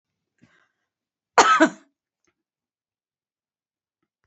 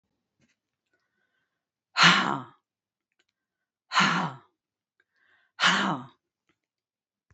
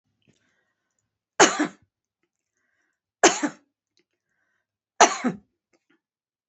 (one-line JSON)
{"cough_length": "4.3 s", "cough_amplitude": 27816, "cough_signal_mean_std_ratio": 0.2, "exhalation_length": "7.3 s", "exhalation_amplitude": 19619, "exhalation_signal_mean_std_ratio": 0.3, "three_cough_length": "6.5 s", "three_cough_amplitude": 32767, "three_cough_signal_mean_std_ratio": 0.22, "survey_phase": "beta (2021-08-13 to 2022-03-07)", "age": "65+", "gender": "Female", "wearing_mask": "No", "symptom_none": true, "smoker_status": "Never smoked", "respiratory_condition_asthma": false, "respiratory_condition_other": false, "recruitment_source": "REACT", "submission_delay": "2 days", "covid_test_result": "Negative", "covid_test_method": "RT-qPCR", "influenza_a_test_result": "Negative", "influenza_b_test_result": "Negative"}